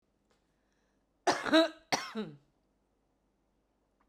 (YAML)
cough_length: 4.1 s
cough_amplitude: 7140
cough_signal_mean_std_ratio: 0.27
survey_phase: beta (2021-08-13 to 2022-03-07)
age: 45-64
gender: Female
wearing_mask: 'No'
symptom_none: true
smoker_status: Current smoker (11 or more cigarettes per day)
respiratory_condition_asthma: false
respiratory_condition_other: false
recruitment_source: REACT
submission_delay: 1 day
covid_test_result: Negative
covid_test_method: RT-qPCR